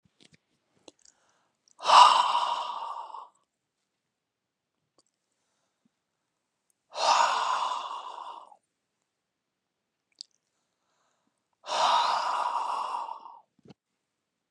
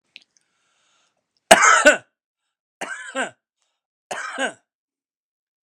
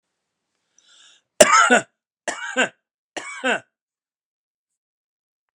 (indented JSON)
{
  "exhalation_length": "14.5 s",
  "exhalation_amplitude": 24324,
  "exhalation_signal_mean_std_ratio": 0.34,
  "three_cough_length": "5.7 s",
  "three_cough_amplitude": 32768,
  "three_cough_signal_mean_std_ratio": 0.26,
  "cough_length": "5.5 s",
  "cough_amplitude": 32768,
  "cough_signal_mean_std_ratio": 0.28,
  "survey_phase": "alpha (2021-03-01 to 2021-08-12)",
  "age": "65+",
  "gender": "Male",
  "wearing_mask": "No",
  "symptom_cough_any": true,
  "smoker_status": "Never smoked",
  "respiratory_condition_asthma": false,
  "respiratory_condition_other": false,
  "recruitment_source": "REACT",
  "submission_delay": "4 days",
  "covid_test_result": "Negative",
  "covid_test_method": "RT-qPCR"
}